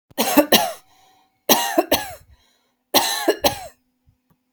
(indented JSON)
{
  "three_cough_length": "4.5 s",
  "three_cough_amplitude": 32768,
  "three_cough_signal_mean_std_ratio": 0.41,
  "survey_phase": "beta (2021-08-13 to 2022-03-07)",
  "age": "45-64",
  "gender": "Female",
  "wearing_mask": "No",
  "symptom_none": true,
  "smoker_status": "Ex-smoker",
  "respiratory_condition_asthma": false,
  "respiratory_condition_other": false,
  "recruitment_source": "REACT",
  "submission_delay": "1 day",
  "covid_test_result": "Negative",
  "covid_test_method": "RT-qPCR",
  "influenza_a_test_result": "Negative",
  "influenza_b_test_result": "Negative"
}